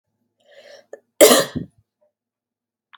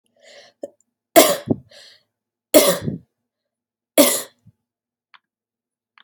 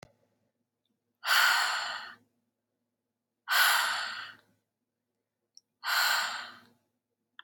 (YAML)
cough_length: 3.0 s
cough_amplitude: 32768
cough_signal_mean_std_ratio: 0.24
three_cough_length: 6.0 s
three_cough_amplitude: 32768
three_cough_signal_mean_std_ratio: 0.27
exhalation_length: 7.4 s
exhalation_amplitude: 9269
exhalation_signal_mean_std_ratio: 0.42
survey_phase: beta (2021-08-13 to 2022-03-07)
age: 18-44
gender: Female
wearing_mask: 'No'
symptom_none: true
smoker_status: Ex-smoker
respiratory_condition_asthma: false
respiratory_condition_other: false
recruitment_source: REACT
submission_delay: 2 days
covid_test_result: Negative
covid_test_method: RT-qPCR
influenza_a_test_result: Negative
influenza_b_test_result: Negative